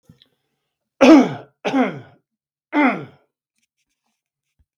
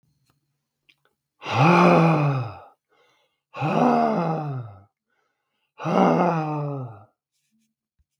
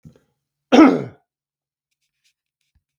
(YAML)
three_cough_length: 4.8 s
three_cough_amplitude: 32768
three_cough_signal_mean_std_ratio: 0.3
exhalation_length: 8.2 s
exhalation_amplitude: 23195
exhalation_signal_mean_std_ratio: 0.49
cough_length: 3.0 s
cough_amplitude: 32768
cough_signal_mean_std_ratio: 0.24
survey_phase: beta (2021-08-13 to 2022-03-07)
age: 65+
gender: Male
wearing_mask: 'No'
symptom_none: true
smoker_status: Never smoked
respiratory_condition_asthma: false
respiratory_condition_other: false
recruitment_source: REACT
submission_delay: 1 day
covid_test_result: Negative
covid_test_method: RT-qPCR
influenza_a_test_result: Negative
influenza_b_test_result: Negative